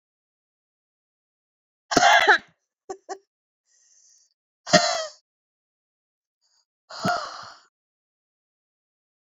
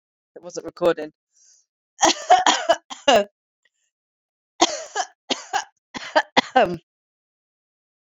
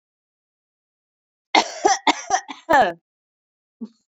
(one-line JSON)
{"exhalation_length": "9.3 s", "exhalation_amplitude": 27112, "exhalation_signal_mean_std_ratio": 0.25, "three_cough_length": "8.2 s", "three_cough_amplitude": 28560, "three_cough_signal_mean_std_ratio": 0.34, "cough_length": "4.2 s", "cough_amplitude": 31215, "cough_signal_mean_std_ratio": 0.32, "survey_phase": "beta (2021-08-13 to 2022-03-07)", "age": "18-44", "gender": "Female", "wearing_mask": "No", "symptom_runny_or_blocked_nose": true, "symptom_shortness_of_breath": true, "symptom_sore_throat": true, "symptom_abdominal_pain": true, "symptom_fatigue": true, "symptom_headache": true, "symptom_change_to_sense_of_smell_or_taste": true, "symptom_loss_of_taste": true, "symptom_onset": "2 days", "smoker_status": "Ex-smoker", "respiratory_condition_asthma": false, "respiratory_condition_other": false, "recruitment_source": "Test and Trace", "submission_delay": "2 days", "covid_test_result": "Positive", "covid_test_method": "RT-qPCR"}